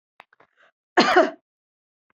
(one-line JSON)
{"cough_length": "2.1 s", "cough_amplitude": 24121, "cough_signal_mean_std_ratio": 0.3, "survey_phase": "beta (2021-08-13 to 2022-03-07)", "age": "45-64", "gender": "Female", "wearing_mask": "No", "symptom_none": true, "smoker_status": "Never smoked", "respiratory_condition_asthma": false, "respiratory_condition_other": false, "recruitment_source": "REACT", "submission_delay": "1 day", "covid_test_result": "Negative", "covid_test_method": "RT-qPCR"}